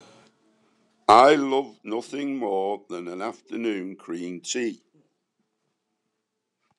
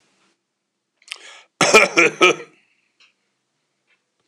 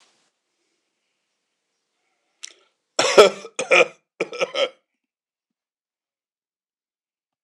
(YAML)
exhalation_length: 6.8 s
exhalation_amplitude: 26028
exhalation_signal_mean_std_ratio: 0.39
cough_length: 4.3 s
cough_amplitude: 26028
cough_signal_mean_std_ratio: 0.29
three_cough_length: 7.4 s
three_cough_amplitude: 26028
three_cough_signal_mean_std_ratio: 0.22
survey_phase: alpha (2021-03-01 to 2021-08-12)
age: 65+
gender: Male
wearing_mask: 'No'
symptom_headache: true
smoker_status: Never smoked
respiratory_condition_asthma: false
respiratory_condition_other: false
recruitment_source: Test and Trace
submission_delay: 1 day
covid_test_result: Positive
covid_test_method: RT-qPCR
covid_ct_value: 12.4
covid_ct_gene: ORF1ab gene
covid_ct_mean: 12.9
covid_viral_load: 58000000 copies/ml
covid_viral_load_category: High viral load (>1M copies/ml)